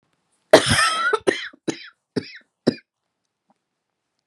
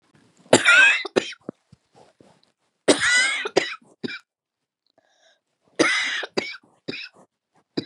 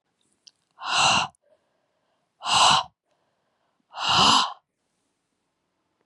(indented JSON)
{
  "cough_length": "4.3 s",
  "cough_amplitude": 32768,
  "cough_signal_mean_std_ratio": 0.32,
  "three_cough_length": "7.9 s",
  "three_cough_amplitude": 32767,
  "three_cough_signal_mean_std_ratio": 0.37,
  "exhalation_length": "6.1 s",
  "exhalation_amplitude": 20578,
  "exhalation_signal_mean_std_ratio": 0.37,
  "survey_phase": "beta (2021-08-13 to 2022-03-07)",
  "age": "45-64",
  "gender": "Female",
  "wearing_mask": "No",
  "symptom_cough_any": true,
  "symptom_runny_or_blocked_nose": true,
  "symptom_shortness_of_breath": true,
  "symptom_sore_throat": true,
  "symptom_fatigue": true,
  "symptom_headache": true,
  "symptom_onset": "4 days",
  "smoker_status": "Ex-smoker",
  "respiratory_condition_asthma": false,
  "respiratory_condition_other": false,
  "recruitment_source": "Test and Trace",
  "submission_delay": "2 days",
  "covid_test_result": "Positive",
  "covid_test_method": "RT-qPCR",
  "covid_ct_value": 24.9,
  "covid_ct_gene": "ORF1ab gene",
  "covid_ct_mean": 25.6,
  "covid_viral_load": "4100 copies/ml",
  "covid_viral_load_category": "Minimal viral load (< 10K copies/ml)"
}